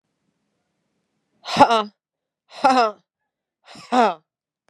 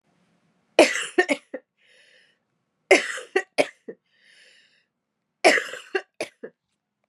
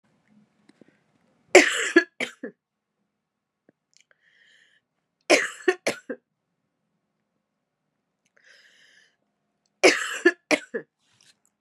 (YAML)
exhalation_length: 4.7 s
exhalation_amplitude: 32767
exhalation_signal_mean_std_ratio: 0.31
cough_length: 7.1 s
cough_amplitude: 32044
cough_signal_mean_std_ratio: 0.27
three_cough_length: 11.6 s
three_cough_amplitude: 32767
three_cough_signal_mean_std_ratio: 0.22
survey_phase: beta (2021-08-13 to 2022-03-07)
age: 18-44
gender: Female
wearing_mask: 'No'
symptom_cough_any: true
symptom_shortness_of_breath: true
symptom_sore_throat: true
symptom_fatigue: true
symptom_fever_high_temperature: true
symptom_headache: true
symptom_other: true
smoker_status: Never smoked
respiratory_condition_asthma: false
respiratory_condition_other: false
recruitment_source: Test and Trace
submission_delay: 3 days
covid_test_result: Positive
covid_test_method: LFT